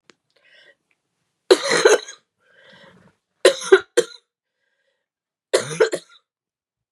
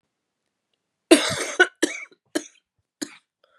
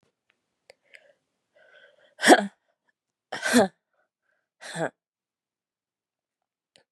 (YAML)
three_cough_length: 6.9 s
three_cough_amplitude: 32736
three_cough_signal_mean_std_ratio: 0.27
cough_length: 3.6 s
cough_amplitude: 31802
cough_signal_mean_std_ratio: 0.26
exhalation_length: 6.9 s
exhalation_amplitude: 26706
exhalation_signal_mean_std_ratio: 0.2
survey_phase: beta (2021-08-13 to 2022-03-07)
age: 18-44
gender: Female
wearing_mask: 'No'
symptom_cough_any: true
symptom_runny_or_blocked_nose: true
symptom_sore_throat: true
symptom_diarrhoea: true
symptom_fatigue: true
symptom_headache: true
symptom_onset: 3 days
smoker_status: Never smoked
respiratory_condition_asthma: false
respiratory_condition_other: false
recruitment_source: Test and Trace
submission_delay: 2 days
covid_test_result: Positive
covid_test_method: RT-qPCR
covid_ct_value: 14.8
covid_ct_gene: ORF1ab gene